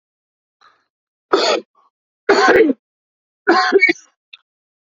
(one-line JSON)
{"three_cough_length": "4.9 s", "three_cough_amplitude": 28565, "three_cough_signal_mean_std_ratio": 0.4, "survey_phase": "beta (2021-08-13 to 2022-03-07)", "age": "18-44", "gender": "Male", "wearing_mask": "No", "symptom_cough_any": true, "symptom_new_continuous_cough": true, "symptom_runny_or_blocked_nose": true, "symptom_shortness_of_breath": true, "symptom_sore_throat": true, "symptom_fatigue": true, "symptom_headache": true, "symptom_change_to_sense_of_smell_or_taste": true, "symptom_loss_of_taste": true, "symptom_other": true, "smoker_status": "Ex-smoker", "respiratory_condition_asthma": false, "respiratory_condition_other": false, "recruitment_source": "Test and Trace", "submission_delay": "0 days", "covid_test_result": "Positive", "covid_test_method": "LFT"}